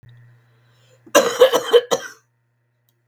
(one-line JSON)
{"cough_length": "3.1 s", "cough_amplitude": 32768, "cough_signal_mean_std_ratio": 0.34, "survey_phase": "beta (2021-08-13 to 2022-03-07)", "age": "65+", "gender": "Female", "wearing_mask": "No", "symptom_cough_any": true, "symptom_runny_or_blocked_nose": true, "symptom_sore_throat": true, "symptom_headache": true, "symptom_onset": "11 days", "smoker_status": "Current smoker (e-cigarettes or vapes only)", "respiratory_condition_asthma": false, "respiratory_condition_other": true, "recruitment_source": "REACT", "submission_delay": "7 days", "covid_test_result": "Negative", "covid_test_method": "RT-qPCR", "influenza_a_test_result": "Negative", "influenza_b_test_result": "Negative"}